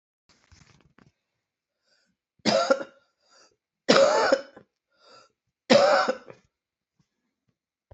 {"three_cough_length": "7.9 s", "three_cough_amplitude": 24850, "three_cough_signal_mean_std_ratio": 0.32, "survey_phase": "beta (2021-08-13 to 2022-03-07)", "age": "45-64", "gender": "Female", "wearing_mask": "No", "symptom_cough_any": true, "symptom_sore_throat": true, "symptom_onset": "27 days", "smoker_status": "Ex-smoker", "respiratory_condition_asthma": false, "respiratory_condition_other": false, "recruitment_source": "Test and Trace", "submission_delay": "24 days", "covid_test_result": "Negative", "covid_test_method": "RT-qPCR"}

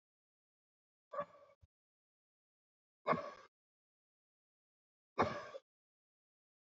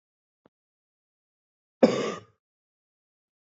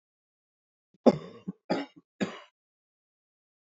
{"exhalation_length": "6.7 s", "exhalation_amplitude": 3367, "exhalation_signal_mean_std_ratio": 0.21, "cough_length": "3.5 s", "cough_amplitude": 19885, "cough_signal_mean_std_ratio": 0.18, "three_cough_length": "3.8 s", "three_cough_amplitude": 18583, "three_cough_signal_mean_std_ratio": 0.2, "survey_phase": "alpha (2021-03-01 to 2021-08-12)", "age": "45-64", "gender": "Male", "wearing_mask": "No", "symptom_cough_any": true, "symptom_fatigue": true, "symptom_fever_high_temperature": true, "symptom_headache": true, "symptom_change_to_sense_of_smell_or_taste": true, "symptom_loss_of_taste": true, "symptom_onset": "6 days", "smoker_status": "Ex-smoker", "respiratory_condition_asthma": false, "respiratory_condition_other": false, "recruitment_source": "Test and Trace", "submission_delay": "2 days", "covid_test_result": "Positive", "covid_test_method": "RT-qPCR", "covid_ct_value": 15.5, "covid_ct_gene": "ORF1ab gene", "covid_ct_mean": 15.9, "covid_viral_load": "6300000 copies/ml", "covid_viral_load_category": "High viral load (>1M copies/ml)"}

